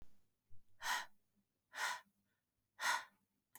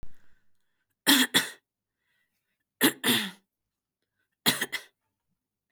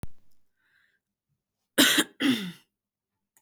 {"exhalation_length": "3.6 s", "exhalation_amplitude": 1704, "exhalation_signal_mean_std_ratio": 0.41, "three_cough_length": "5.7 s", "three_cough_amplitude": 16376, "three_cough_signal_mean_std_ratio": 0.31, "cough_length": "3.4 s", "cough_amplitude": 17934, "cough_signal_mean_std_ratio": 0.34, "survey_phase": "beta (2021-08-13 to 2022-03-07)", "age": "18-44", "gender": "Female", "wearing_mask": "No", "symptom_none": true, "smoker_status": "Never smoked", "respiratory_condition_asthma": false, "respiratory_condition_other": false, "recruitment_source": "REACT", "submission_delay": "2 days", "covid_test_result": "Negative", "covid_test_method": "RT-qPCR", "influenza_a_test_result": "Negative", "influenza_b_test_result": "Negative"}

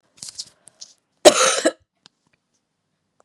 {"cough_length": "3.2 s", "cough_amplitude": 32768, "cough_signal_mean_std_ratio": 0.25, "survey_phase": "beta (2021-08-13 to 2022-03-07)", "age": "18-44", "gender": "Female", "wearing_mask": "No", "symptom_cough_any": true, "symptom_runny_or_blocked_nose": true, "symptom_shortness_of_breath": true, "symptom_sore_throat": true, "symptom_fatigue": true, "symptom_headache": true, "symptom_change_to_sense_of_smell_or_taste": true, "symptom_onset": "3 days", "smoker_status": "Never smoked", "respiratory_condition_asthma": false, "respiratory_condition_other": false, "recruitment_source": "Test and Trace", "submission_delay": "2 days", "covid_test_result": "Positive", "covid_test_method": "RT-qPCR", "covid_ct_value": 22.4, "covid_ct_gene": "N gene"}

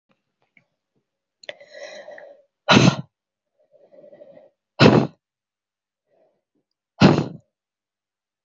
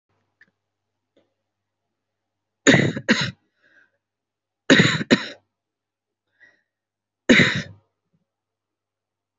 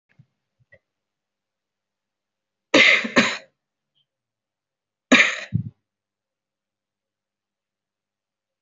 {"exhalation_length": "8.4 s", "exhalation_amplitude": 27269, "exhalation_signal_mean_std_ratio": 0.24, "three_cough_length": "9.4 s", "three_cough_amplitude": 27950, "three_cough_signal_mean_std_ratio": 0.26, "cough_length": "8.6 s", "cough_amplitude": 26309, "cough_signal_mean_std_ratio": 0.23, "survey_phase": "alpha (2021-03-01 to 2021-08-12)", "age": "18-44", "gender": "Female", "wearing_mask": "No", "symptom_fatigue": true, "smoker_status": "Never smoked", "respiratory_condition_asthma": false, "respiratory_condition_other": false, "recruitment_source": "Test and Trace", "submission_delay": "2 days", "covid_test_result": "Positive", "covid_test_method": "RT-qPCR"}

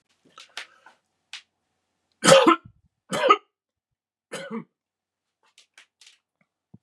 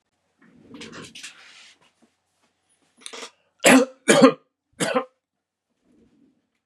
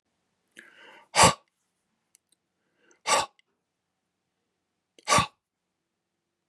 {"three_cough_length": "6.8 s", "three_cough_amplitude": 28529, "three_cough_signal_mean_std_ratio": 0.23, "cough_length": "6.7 s", "cough_amplitude": 32767, "cough_signal_mean_std_ratio": 0.25, "exhalation_length": "6.5 s", "exhalation_amplitude": 24597, "exhalation_signal_mean_std_ratio": 0.21, "survey_phase": "beta (2021-08-13 to 2022-03-07)", "age": "45-64", "gender": "Male", "wearing_mask": "No", "symptom_none": true, "smoker_status": "Never smoked", "respiratory_condition_asthma": false, "respiratory_condition_other": false, "recruitment_source": "REACT", "submission_delay": "1 day", "covid_test_result": "Negative", "covid_test_method": "RT-qPCR", "influenza_a_test_result": "Unknown/Void", "influenza_b_test_result": "Unknown/Void"}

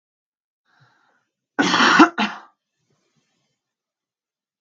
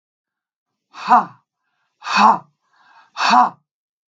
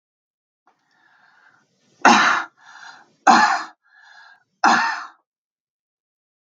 {"cough_length": "4.6 s", "cough_amplitude": 32767, "cough_signal_mean_std_ratio": 0.27, "exhalation_length": "4.1 s", "exhalation_amplitude": 32768, "exhalation_signal_mean_std_ratio": 0.34, "three_cough_length": "6.5 s", "three_cough_amplitude": 32768, "three_cough_signal_mean_std_ratio": 0.32, "survey_phase": "beta (2021-08-13 to 2022-03-07)", "age": "18-44", "gender": "Female", "wearing_mask": "No", "symptom_headache": true, "smoker_status": "Current smoker (1 to 10 cigarettes per day)", "respiratory_condition_asthma": false, "respiratory_condition_other": false, "recruitment_source": "REACT", "submission_delay": "2 days", "covid_test_result": "Negative", "covid_test_method": "RT-qPCR"}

